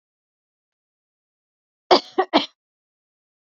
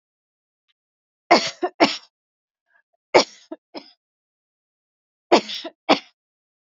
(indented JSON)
{
  "cough_length": "3.5 s",
  "cough_amplitude": 28726,
  "cough_signal_mean_std_ratio": 0.19,
  "three_cough_length": "6.7 s",
  "three_cough_amplitude": 30185,
  "three_cough_signal_mean_std_ratio": 0.23,
  "survey_phase": "beta (2021-08-13 to 2022-03-07)",
  "age": "45-64",
  "gender": "Female",
  "wearing_mask": "No",
  "symptom_fatigue": true,
  "symptom_onset": "2 days",
  "smoker_status": "Never smoked",
  "respiratory_condition_asthma": false,
  "respiratory_condition_other": false,
  "recruitment_source": "Test and Trace",
  "submission_delay": "2 days",
  "covid_test_result": "Positive",
  "covid_test_method": "ePCR"
}